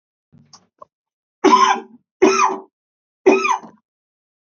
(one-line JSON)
{"three_cough_length": "4.4 s", "three_cough_amplitude": 32768, "three_cough_signal_mean_std_ratio": 0.38, "survey_phase": "beta (2021-08-13 to 2022-03-07)", "age": "18-44", "gender": "Male", "wearing_mask": "No", "symptom_cough_any": true, "symptom_runny_or_blocked_nose": true, "symptom_fever_high_temperature": true, "symptom_change_to_sense_of_smell_or_taste": true, "symptom_loss_of_taste": true, "symptom_onset": "4 days", "smoker_status": "Never smoked", "respiratory_condition_asthma": false, "respiratory_condition_other": false, "recruitment_source": "Test and Trace", "submission_delay": "2 days", "covid_test_result": "Positive", "covid_test_method": "RT-qPCR"}